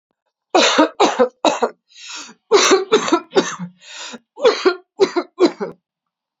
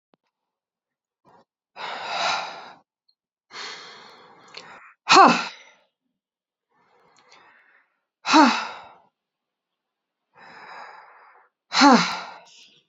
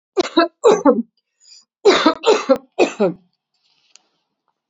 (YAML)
three_cough_length: 6.4 s
three_cough_amplitude: 32767
three_cough_signal_mean_std_ratio: 0.48
exhalation_length: 12.9 s
exhalation_amplitude: 29041
exhalation_signal_mean_std_ratio: 0.26
cough_length: 4.7 s
cough_amplitude: 30747
cough_signal_mean_std_ratio: 0.41
survey_phase: beta (2021-08-13 to 2022-03-07)
age: 45-64
gender: Female
wearing_mask: 'Yes'
symptom_cough_any: true
symptom_runny_or_blocked_nose: true
symptom_sore_throat: true
symptom_fatigue: true
symptom_headache: true
symptom_onset: 4 days
smoker_status: Never smoked
respiratory_condition_asthma: false
respiratory_condition_other: false
recruitment_source: Test and Trace
submission_delay: 2 days
covid_test_result: Positive
covid_test_method: RT-qPCR
covid_ct_value: 16.0
covid_ct_gene: ORF1ab gene
covid_ct_mean: 16.0
covid_viral_load: 5500000 copies/ml
covid_viral_load_category: High viral load (>1M copies/ml)